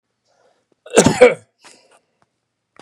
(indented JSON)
{
  "cough_length": "2.8 s",
  "cough_amplitude": 32768,
  "cough_signal_mean_std_ratio": 0.26,
  "survey_phase": "beta (2021-08-13 to 2022-03-07)",
  "age": "45-64",
  "gender": "Male",
  "wearing_mask": "No",
  "symptom_none": true,
  "smoker_status": "Never smoked",
  "respiratory_condition_asthma": false,
  "respiratory_condition_other": false,
  "recruitment_source": "REACT",
  "submission_delay": "2 days",
  "covid_test_result": "Negative",
  "covid_test_method": "RT-qPCR",
  "influenza_a_test_result": "Negative",
  "influenza_b_test_result": "Negative"
}